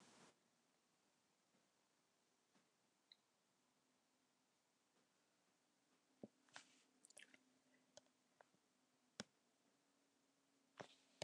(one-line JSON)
{"cough_length": "11.2 s", "cough_amplitude": 960, "cough_signal_mean_std_ratio": 0.28, "survey_phase": "beta (2021-08-13 to 2022-03-07)", "age": "65+", "gender": "Female", "wearing_mask": "No", "symptom_none": true, "smoker_status": "Never smoked", "respiratory_condition_asthma": true, "respiratory_condition_other": false, "recruitment_source": "REACT", "submission_delay": "3 days", "covid_test_result": "Negative", "covid_test_method": "RT-qPCR"}